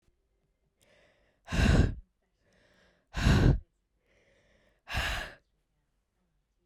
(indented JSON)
{
  "exhalation_length": "6.7 s",
  "exhalation_amplitude": 10684,
  "exhalation_signal_mean_std_ratio": 0.33,
  "survey_phase": "beta (2021-08-13 to 2022-03-07)",
  "age": "18-44",
  "gender": "Female",
  "wearing_mask": "No",
  "symptom_none": true,
  "smoker_status": "Never smoked",
  "respiratory_condition_asthma": false,
  "respiratory_condition_other": false,
  "recruitment_source": "REACT",
  "submission_delay": "4 days",
  "covid_test_result": "Negative",
  "covid_test_method": "RT-qPCR"
}